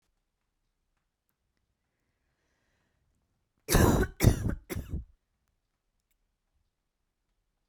{
  "three_cough_length": "7.7 s",
  "three_cough_amplitude": 15906,
  "three_cough_signal_mean_std_ratio": 0.24,
  "survey_phase": "beta (2021-08-13 to 2022-03-07)",
  "age": "18-44",
  "gender": "Female",
  "wearing_mask": "No",
  "symptom_fatigue": true,
  "smoker_status": "Never smoked",
  "respiratory_condition_asthma": true,
  "respiratory_condition_other": false,
  "recruitment_source": "REACT",
  "submission_delay": "1 day",
  "covid_test_result": "Negative",
  "covid_test_method": "RT-qPCR"
}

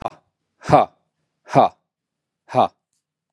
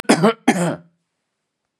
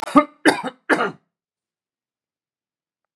{
  "exhalation_length": "3.3 s",
  "exhalation_amplitude": 32055,
  "exhalation_signal_mean_std_ratio": 0.28,
  "cough_length": "1.8 s",
  "cough_amplitude": 31872,
  "cough_signal_mean_std_ratio": 0.39,
  "three_cough_length": "3.2 s",
  "three_cough_amplitude": 32767,
  "three_cough_signal_mean_std_ratio": 0.27,
  "survey_phase": "beta (2021-08-13 to 2022-03-07)",
  "age": "45-64",
  "gender": "Male",
  "wearing_mask": "No",
  "symptom_cough_any": true,
  "symptom_runny_or_blocked_nose": true,
  "symptom_fatigue": true,
  "symptom_loss_of_taste": true,
  "symptom_onset": "5 days",
  "smoker_status": "Ex-smoker",
  "respiratory_condition_asthma": false,
  "respiratory_condition_other": false,
  "recruitment_source": "Test and Trace",
  "submission_delay": "1 day",
  "covid_test_result": "Positive",
  "covid_test_method": "ePCR"
}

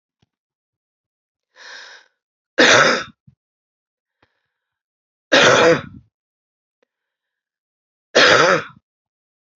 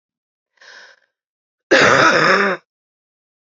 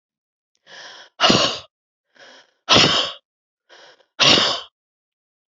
{
  "three_cough_length": "9.6 s",
  "three_cough_amplitude": 30793,
  "three_cough_signal_mean_std_ratio": 0.31,
  "cough_length": "3.6 s",
  "cough_amplitude": 30025,
  "cough_signal_mean_std_ratio": 0.41,
  "exhalation_length": "5.5 s",
  "exhalation_amplitude": 32767,
  "exhalation_signal_mean_std_ratio": 0.36,
  "survey_phase": "beta (2021-08-13 to 2022-03-07)",
  "age": "45-64",
  "gender": "Female",
  "wearing_mask": "No",
  "symptom_cough_any": true,
  "symptom_runny_or_blocked_nose": true,
  "symptom_shortness_of_breath": true,
  "symptom_sore_throat": true,
  "symptom_abdominal_pain": true,
  "symptom_fatigue": true,
  "symptom_fever_high_temperature": true,
  "symptom_headache": true,
  "symptom_change_to_sense_of_smell_or_taste": true,
  "symptom_onset": "3 days",
  "smoker_status": "Never smoked",
  "respiratory_condition_asthma": true,
  "respiratory_condition_other": true,
  "recruitment_source": "Test and Trace",
  "submission_delay": "2 days",
  "covid_test_result": "Positive",
  "covid_test_method": "RT-qPCR",
  "covid_ct_value": 18.3,
  "covid_ct_gene": "ORF1ab gene",
  "covid_ct_mean": 18.8,
  "covid_viral_load": "680000 copies/ml",
  "covid_viral_load_category": "Low viral load (10K-1M copies/ml)"
}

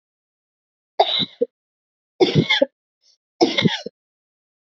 {
  "cough_length": "4.6 s",
  "cough_amplitude": 27173,
  "cough_signal_mean_std_ratio": 0.34,
  "survey_phase": "beta (2021-08-13 to 2022-03-07)",
  "age": "45-64",
  "gender": "Female",
  "wearing_mask": "No",
  "symptom_none": true,
  "smoker_status": "Never smoked",
  "respiratory_condition_asthma": true,
  "respiratory_condition_other": false,
  "recruitment_source": "REACT",
  "submission_delay": "1 day",
  "covid_test_result": "Negative",
  "covid_test_method": "RT-qPCR"
}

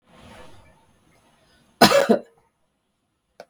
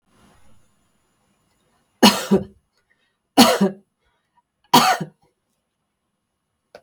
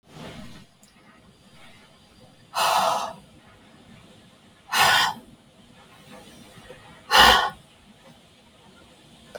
{
  "cough_length": "3.5 s",
  "cough_amplitude": 32768,
  "cough_signal_mean_std_ratio": 0.25,
  "three_cough_length": "6.8 s",
  "three_cough_amplitude": 32766,
  "three_cough_signal_mean_std_ratio": 0.27,
  "exhalation_length": "9.4 s",
  "exhalation_amplitude": 29049,
  "exhalation_signal_mean_std_ratio": 0.33,
  "survey_phase": "beta (2021-08-13 to 2022-03-07)",
  "age": "45-64",
  "gender": "Female",
  "wearing_mask": "No",
  "symptom_sore_throat": true,
  "smoker_status": "Never smoked",
  "respiratory_condition_asthma": false,
  "respiratory_condition_other": false,
  "recruitment_source": "REACT",
  "submission_delay": "1 day",
  "covid_test_result": "Negative",
  "covid_test_method": "RT-qPCR",
  "influenza_a_test_result": "Negative",
  "influenza_b_test_result": "Negative"
}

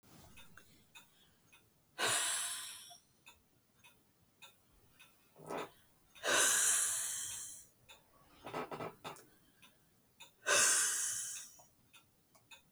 {
  "exhalation_length": "12.7 s",
  "exhalation_amplitude": 4716,
  "exhalation_signal_mean_std_ratio": 0.43,
  "survey_phase": "beta (2021-08-13 to 2022-03-07)",
  "age": "18-44",
  "gender": "Female",
  "wearing_mask": "No",
  "symptom_sore_throat": true,
  "symptom_fatigue": true,
  "symptom_headache": true,
  "symptom_onset": "4 days",
  "smoker_status": "Ex-smoker",
  "respiratory_condition_asthma": true,
  "respiratory_condition_other": false,
  "recruitment_source": "Test and Trace",
  "submission_delay": "2 days",
  "covid_test_result": "Negative",
  "covid_test_method": "RT-qPCR"
}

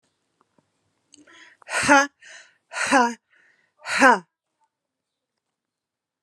{
  "exhalation_length": "6.2 s",
  "exhalation_amplitude": 28757,
  "exhalation_signal_mean_std_ratio": 0.3,
  "survey_phase": "alpha (2021-03-01 to 2021-08-12)",
  "age": "18-44",
  "gender": "Female",
  "wearing_mask": "No",
  "symptom_none": true,
  "smoker_status": "Never smoked",
  "respiratory_condition_asthma": true,
  "respiratory_condition_other": false,
  "recruitment_source": "REACT",
  "submission_delay": "1 day",
  "covid_test_result": "Negative",
  "covid_test_method": "RT-qPCR"
}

